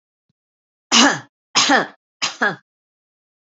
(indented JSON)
{
  "three_cough_length": "3.6 s",
  "three_cough_amplitude": 32488,
  "three_cough_signal_mean_std_ratio": 0.35,
  "survey_phase": "alpha (2021-03-01 to 2021-08-12)",
  "age": "45-64",
  "gender": "Female",
  "wearing_mask": "No",
  "symptom_none": true,
  "smoker_status": "Never smoked",
  "respiratory_condition_asthma": false,
  "respiratory_condition_other": false,
  "recruitment_source": "REACT",
  "submission_delay": "2 days",
  "covid_test_result": "Negative",
  "covid_test_method": "RT-qPCR"
}